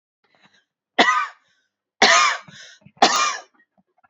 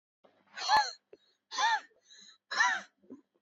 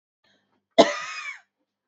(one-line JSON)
{"three_cough_length": "4.1 s", "three_cough_amplitude": 30409, "three_cough_signal_mean_std_ratio": 0.39, "exhalation_length": "3.4 s", "exhalation_amplitude": 6377, "exhalation_signal_mean_std_ratio": 0.41, "cough_length": "1.9 s", "cough_amplitude": 26750, "cough_signal_mean_std_ratio": 0.25, "survey_phase": "beta (2021-08-13 to 2022-03-07)", "age": "18-44", "gender": "Female", "wearing_mask": "No", "symptom_fatigue": true, "smoker_status": "Ex-smoker", "respiratory_condition_asthma": false, "respiratory_condition_other": false, "recruitment_source": "REACT", "submission_delay": "0 days", "covid_test_result": "Negative", "covid_test_method": "RT-qPCR", "influenza_a_test_result": "Negative", "influenza_b_test_result": "Negative"}